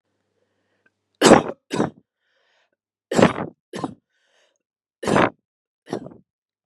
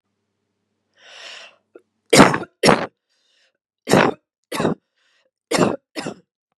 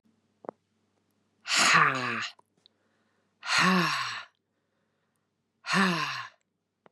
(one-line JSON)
{"three_cough_length": "6.7 s", "three_cough_amplitude": 32768, "three_cough_signal_mean_std_ratio": 0.27, "cough_length": "6.6 s", "cough_amplitude": 32768, "cough_signal_mean_std_ratio": 0.3, "exhalation_length": "6.9 s", "exhalation_amplitude": 14507, "exhalation_signal_mean_std_ratio": 0.42, "survey_phase": "beta (2021-08-13 to 2022-03-07)", "age": "45-64", "gender": "Female", "wearing_mask": "No", "symptom_none": true, "smoker_status": "Never smoked", "respiratory_condition_asthma": false, "respiratory_condition_other": false, "recruitment_source": "REACT", "submission_delay": "1 day", "covid_test_result": "Negative", "covid_test_method": "RT-qPCR", "influenza_a_test_result": "Negative", "influenza_b_test_result": "Negative"}